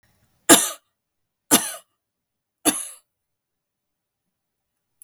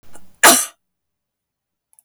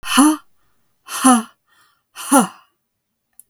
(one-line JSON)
{"three_cough_length": "5.0 s", "three_cough_amplitude": 32768, "three_cough_signal_mean_std_ratio": 0.21, "cough_length": "2.0 s", "cough_amplitude": 32768, "cough_signal_mean_std_ratio": 0.28, "exhalation_length": "3.5 s", "exhalation_amplitude": 32768, "exhalation_signal_mean_std_ratio": 0.38, "survey_phase": "beta (2021-08-13 to 2022-03-07)", "age": "45-64", "gender": "Female", "wearing_mask": "No", "symptom_none": true, "smoker_status": "Never smoked", "respiratory_condition_asthma": false, "respiratory_condition_other": false, "recruitment_source": "REACT", "submission_delay": "1 day", "covid_test_result": "Negative", "covid_test_method": "RT-qPCR", "influenza_a_test_result": "Negative", "influenza_b_test_result": "Negative"}